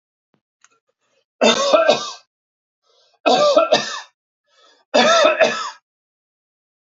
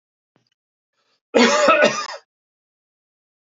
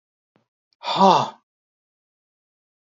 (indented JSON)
{
  "three_cough_length": "6.8 s",
  "three_cough_amplitude": 29026,
  "three_cough_signal_mean_std_ratio": 0.43,
  "cough_length": "3.6 s",
  "cough_amplitude": 27456,
  "cough_signal_mean_std_ratio": 0.35,
  "exhalation_length": "2.9 s",
  "exhalation_amplitude": 29618,
  "exhalation_signal_mean_std_ratio": 0.27,
  "survey_phase": "alpha (2021-03-01 to 2021-08-12)",
  "age": "45-64",
  "gender": "Male",
  "wearing_mask": "No",
  "symptom_none": true,
  "smoker_status": "Never smoked",
  "respiratory_condition_asthma": false,
  "respiratory_condition_other": false,
  "recruitment_source": "REACT",
  "submission_delay": "1 day",
  "covid_test_result": "Negative",
  "covid_test_method": "RT-qPCR"
}